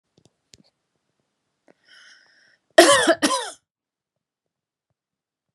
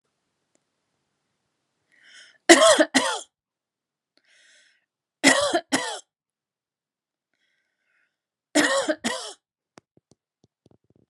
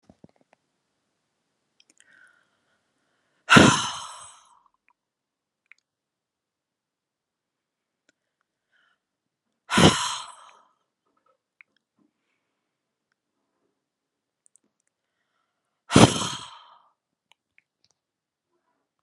{
  "cough_length": "5.5 s",
  "cough_amplitude": 32768,
  "cough_signal_mean_std_ratio": 0.23,
  "three_cough_length": "11.1 s",
  "three_cough_amplitude": 32767,
  "three_cough_signal_mean_std_ratio": 0.27,
  "exhalation_length": "19.0 s",
  "exhalation_amplitude": 32015,
  "exhalation_signal_mean_std_ratio": 0.17,
  "survey_phase": "beta (2021-08-13 to 2022-03-07)",
  "age": "45-64",
  "gender": "Female",
  "wearing_mask": "No",
  "symptom_fatigue": true,
  "symptom_onset": "12 days",
  "smoker_status": "Never smoked",
  "respiratory_condition_asthma": true,
  "respiratory_condition_other": false,
  "recruitment_source": "REACT",
  "submission_delay": "2 days",
  "covid_test_result": "Negative",
  "covid_test_method": "RT-qPCR"
}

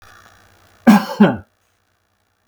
{
  "cough_length": "2.5 s",
  "cough_amplitude": 32768,
  "cough_signal_mean_std_ratio": 0.3,
  "survey_phase": "beta (2021-08-13 to 2022-03-07)",
  "age": "45-64",
  "gender": "Male",
  "wearing_mask": "No",
  "symptom_none": true,
  "smoker_status": "Never smoked",
  "respiratory_condition_asthma": false,
  "respiratory_condition_other": false,
  "recruitment_source": "REACT",
  "submission_delay": "2 days",
  "covid_test_result": "Negative",
  "covid_test_method": "RT-qPCR"
}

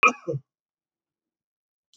{
  "cough_length": "2.0 s",
  "cough_amplitude": 19019,
  "cough_signal_mean_std_ratio": 0.22,
  "survey_phase": "beta (2021-08-13 to 2022-03-07)",
  "age": "65+",
  "gender": "Male",
  "wearing_mask": "No",
  "symptom_none": true,
  "smoker_status": "Never smoked",
  "respiratory_condition_asthma": false,
  "respiratory_condition_other": false,
  "recruitment_source": "REACT",
  "submission_delay": "3 days",
  "covid_test_result": "Negative",
  "covid_test_method": "RT-qPCR",
  "influenza_a_test_result": "Negative",
  "influenza_b_test_result": "Negative"
}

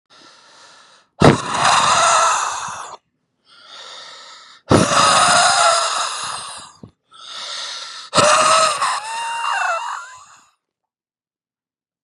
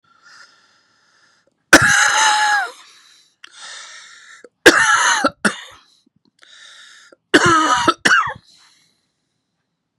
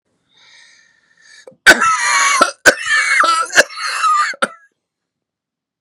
{
  "exhalation_length": "12.0 s",
  "exhalation_amplitude": 32768,
  "exhalation_signal_mean_std_ratio": 0.55,
  "three_cough_length": "10.0 s",
  "three_cough_amplitude": 32768,
  "three_cough_signal_mean_std_ratio": 0.41,
  "cough_length": "5.8 s",
  "cough_amplitude": 32768,
  "cough_signal_mean_std_ratio": 0.5,
  "survey_phase": "beta (2021-08-13 to 2022-03-07)",
  "age": "45-64",
  "gender": "Male",
  "wearing_mask": "No",
  "symptom_cough_any": true,
  "smoker_status": "Never smoked",
  "respiratory_condition_asthma": false,
  "respiratory_condition_other": false,
  "recruitment_source": "Test and Trace",
  "submission_delay": "1 day",
  "covid_test_result": "Positive",
  "covid_test_method": "RT-qPCR",
  "covid_ct_value": 20.1,
  "covid_ct_gene": "ORF1ab gene",
  "covid_ct_mean": 20.5,
  "covid_viral_load": "190000 copies/ml",
  "covid_viral_load_category": "Low viral load (10K-1M copies/ml)"
}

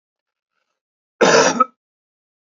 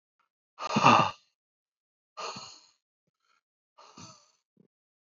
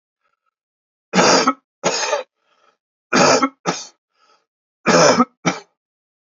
{
  "cough_length": "2.5 s",
  "cough_amplitude": 28580,
  "cough_signal_mean_std_ratio": 0.32,
  "exhalation_length": "5.0 s",
  "exhalation_amplitude": 18958,
  "exhalation_signal_mean_std_ratio": 0.24,
  "three_cough_length": "6.2 s",
  "three_cough_amplitude": 30030,
  "three_cough_signal_mean_std_ratio": 0.41,
  "survey_phase": "beta (2021-08-13 to 2022-03-07)",
  "age": "18-44",
  "gender": "Male",
  "wearing_mask": "No",
  "symptom_cough_any": true,
  "symptom_onset": "8 days",
  "smoker_status": "Never smoked",
  "respiratory_condition_asthma": false,
  "respiratory_condition_other": false,
  "recruitment_source": "REACT",
  "submission_delay": "0 days",
  "covid_test_result": "Negative",
  "covid_test_method": "RT-qPCR",
  "influenza_a_test_result": "Negative",
  "influenza_b_test_result": "Negative"
}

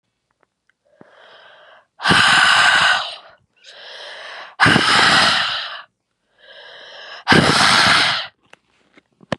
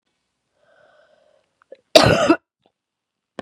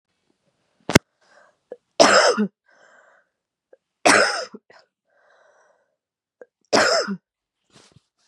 {
  "exhalation_length": "9.4 s",
  "exhalation_amplitude": 32768,
  "exhalation_signal_mean_std_ratio": 0.51,
  "cough_length": "3.4 s",
  "cough_amplitude": 32768,
  "cough_signal_mean_std_ratio": 0.25,
  "three_cough_length": "8.3 s",
  "three_cough_amplitude": 32768,
  "three_cough_signal_mean_std_ratio": 0.3,
  "survey_phase": "beta (2021-08-13 to 2022-03-07)",
  "age": "18-44",
  "gender": "Female",
  "wearing_mask": "No",
  "symptom_cough_any": true,
  "symptom_runny_or_blocked_nose": true,
  "symptom_fatigue": true,
  "symptom_onset": "4 days",
  "smoker_status": "Never smoked",
  "respiratory_condition_asthma": false,
  "respiratory_condition_other": false,
  "recruitment_source": "Test and Trace",
  "submission_delay": "3 days",
  "covid_test_result": "Positive",
  "covid_test_method": "RT-qPCR",
  "covid_ct_value": 27.0,
  "covid_ct_gene": "ORF1ab gene",
  "covid_ct_mean": 27.6,
  "covid_viral_load": "890 copies/ml",
  "covid_viral_load_category": "Minimal viral load (< 10K copies/ml)"
}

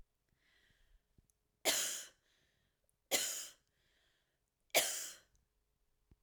{
  "three_cough_length": "6.2 s",
  "three_cough_amplitude": 5017,
  "three_cough_signal_mean_std_ratio": 0.3,
  "survey_phase": "alpha (2021-03-01 to 2021-08-12)",
  "age": "18-44",
  "gender": "Female",
  "wearing_mask": "No",
  "symptom_none": true,
  "smoker_status": "Never smoked",
  "respiratory_condition_asthma": false,
  "respiratory_condition_other": false,
  "recruitment_source": "REACT",
  "submission_delay": "1 day",
  "covid_test_result": "Negative",
  "covid_test_method": "RT-qPCR"
}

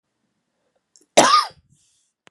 {
  "cough_length": "2.3 s",
  "cough_amplitude": 32768,
  "cough_signal_mean_std_ratio": 0.27,
  "survey_phase": "beta (2021-08-13 to 2022-03-07)",
  "age": "45-64",
  "gender": "Female",
  "wearing_mask": "No",
  "symptom_cough_any": true,
  "symptom_runny_or_blocked_nose": true,
  "symptom_fatigue": true,
  "symptom_fever_high_temperature": true,
  "symptom_headache": true,
  "symptom_change_to_sense_of_smell_or_taste": true,
  "symptom_onset": "4 days",
  "smoker_status": "Never smoked",
  "respiratory_condition_asthma": false,
  "respiratory_condition_other": false,
  "recruitment_source": "Test and Trace",
  "submission_delay": "2 days",
  "covid_test_result": "Positive",
  "covid_test_method": "RT-qPCR",
  "covid_ct_value": 15.4,
  "covid_ct_gene": "ORF1ab gene",
  "covid_ct_mean": 15.7,
  "covid_viral_load": "7200000 copies/ml",
  "covid_viral_load_category": "High viral load (>1M copies/ml)"
}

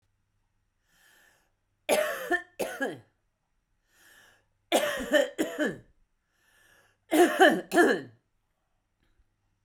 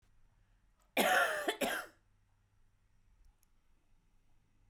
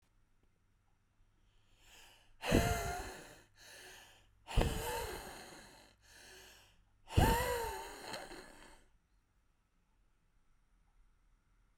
{
  "three_cough_length": "9.6 s",
  "three_cough_amplitude": 17236,
  "three_cough_signal_mean_std_ratio": 0.35,
  "cough_length": "4.7 s",
  "cough_amplitude": 4962,
  "cough_signal_mean_std_ratio": 0.34,
  "exhalation_length": "11.8 s",
  "exhalation_amplitude": 5621,
  "exhalation_signal_mean_std_ratio": 0.35,
  "survey_phase": "beta (2021-08-13 to 2022-03-07)",
  "age": "45-64",
  "gender": "Female",
  "wearing_mask": "No",
  "symptom_cough_any": true,
  "symptom_onset": "12 days",
  "smoker_status": "Never smoked",
  "respiratory_condition_asthma": true,
  "respiratory_condition_other": false,
  "recruitment_source": "REACT",
  "submission_delay": "2 days",
  "covid_test_result": "Negative",
  "covid_test_method": "RT-qPCR",
  "influenza_a_test_result": "Negative",
  "influenza_b_test_result": "Negative"
}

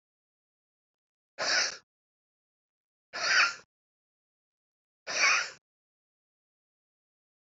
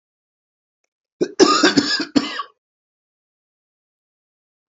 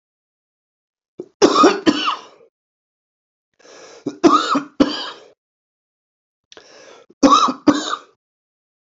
{
  "exhalation_length": "7.6 s",
  "exhalation_amplitude": 7846,
  "exhalation_signal_mean_std_ratio": 0.29,
  "cough_length": "4.7 s",
  "cough_amplitude": 29617,
  "cough_signal_mean_std_ratio": 0.31,
  "three_cough_length": "8.9 s",
  "three_cough_amplitude": 29397,
  "three_cough_signal_mean_std_ratio": 0.34,
  "survey_phase": "alpha (2021-03-01 to 2021-08-12)",
  "age": "45-64",
  "gender": "Male",
  "wearing_mask": "No",
  "symptom_cough_any": true,
  "symptom_fatigue": true,
  "symptom_change_to_sense_of_smell_or_taste": true,
  "smoker_status": "Ex-smoker",
  "respiratory_condition_asthma": false,
  "respiratory_condition_other": false,
  "recruitment_source": "Test and Trace",
  "submission_delay": "2 days",
  "covid_test_result": "Positive",
  "covid_test_method": "RT-qPCR",
  "covid_ct_value": 15.6,
  "covid_ct_gene": "ORF1ab gene",
  "covid_ct_mean": 16.2,
  "covid_viral_load": "4800000 copies/ml",
  "covid_viral_load_category": "High viral load (>1M copies/ml)"
}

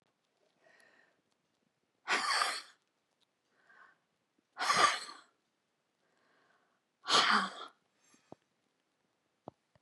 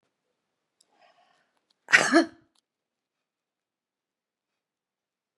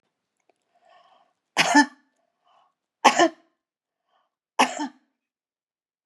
{
  "exhalation_length": "9.8 s",
  "exhalation_amplitude": 6758,
  "exhalation_signal_mean_std_ratio": 0.29,
  "cough_length": "5.4 s",
  "cough_amplitude": 23203,
  "cough_signal_mean_std_ratio": 0.18,
  "three_cough_length": "6.1 s",
  "three_cough_amplitude": 31894,
  "three_cough_signal_mean_std_ratio": 0.24,
  "survey_phase": "beta (2021-08-13 to 2022-03-07)",
  "age": "65+",
  "gender": "Female",
  "wearing_mask": "No",
  "symptom_none": true,
  "symptom_onset": "4 days",
  "smoker_status": "Current smoker (11 or more cigarettes per day)",
  "respiratory_condition_asthma": false,
  "respiratory_condition_other": false,
  "recruitment_source": "REACT",
  "submission_delay": "1 day",
  "covid_test_result": "Negative",
  "covid_test_method": "RT-qPCR",
  "influenza_a_test_result": "Negative",
  "influenza_b_test_result": "Negative"
}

